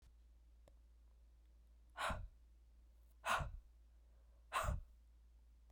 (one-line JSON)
{"exhalation_length": "5.7 s", "exhalation_amplitude": 1638, "exhalation_signal_mean_std_ratio": 0.44, "survey_phase": "beta (2021-08-13 to 2022-03-07)", "age": "18-44", "gender": "Female", "wearing_mask": "Yes", "symptom_new_continuous_cough": true, "symptom_runny_or_blocked_nose": true, "symptom_sore_throat": true, "symptom_fever_high_temperature": true, "symptom_headache": true, "symptom_loss_of_taste": true, "symptom_onset": "4 days", "smoker_status": "Never smoked", "respiratory_condition_asthma": false, "respiratory_condition_other": false, "recruitment_source": "Test and Trace", "submission_delay": "3 days", "covid_test_result": "Positive", "covid_test_method": "RT-qPCR", "covid_ct_value": 19.4, "covid_ct_gene": "ORF1ab gene", "covid_ct_mean": 20.6, "covid_viral_load": "170000 copies/ml", "covid_viral_load_category": "Low viral load (10K-1M copies/ml)"}